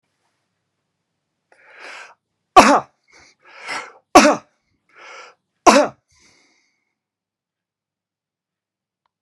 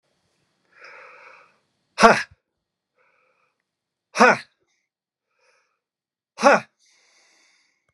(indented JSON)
{
  "three_cough_length": "9.2 s",
  "three_cough_amplitude": 32768,
  "three_cough_signal_mean_std_ratio": 0.21,
  "exhalation_length": "7.9 s",
  "exhalation_amplitude": 32767,
  "exhalation_signal_mean_std_ratio": 0.21,
  "survey_phase": "beta (2021-08-13 to 2022-03-07)",
  "age": "45-64",
  "gender": "Male",
  "wearing_mask": "No",
  "symptom_change_to_sense_of_smell_or_taste": true,
  "symptom_loss_of_taste": true,
  "symptom_other": true,
  "symptom_onset": "4 days",
  "smoker_status": "Ex-smoker",
  "respiratory_condition_asthma": false,
  "respiratory_condition_other": false,
  "recruitment_source": "Test and Trace",
  "submission_delay": "2 days",
  "covid_test_result": "Positive",
  "covid_test_method": "RT-qPCR",
  "covid_ct_value": 16.7,
  "covid_ct_gene": "N gene",
  "covid_ct_mean": 17.1,
  "covid_viral_load": "2500000 copies/ml",
  "covid_viral_load_category": "High viral load (>1M copies/ml)"
}